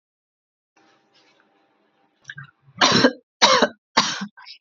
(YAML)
three_cough_length: 4.6 s
three_cough_amplitude: 29389
three_cough_signal_mean_std_ratio: 0.32
survey_phase: beta (2021-08-13 to 2022-03-07)
age: 45-64
gender: Female
wearing_mask: 'No'
symptom_cough_any: true
symptom_runny_or_blocked_nose: true
symptom_onset: 5 days
smoker_status: Never smoked
respiratory_condition_asthma: false
respiratory_condition_other: false
recruitment_source: REACT
submission_delay: 1 day
covid_test_result: Negative
covid_test_method: RT-qPCR
influenza_a_test_result: Negative
influenza_b_test_result: Negative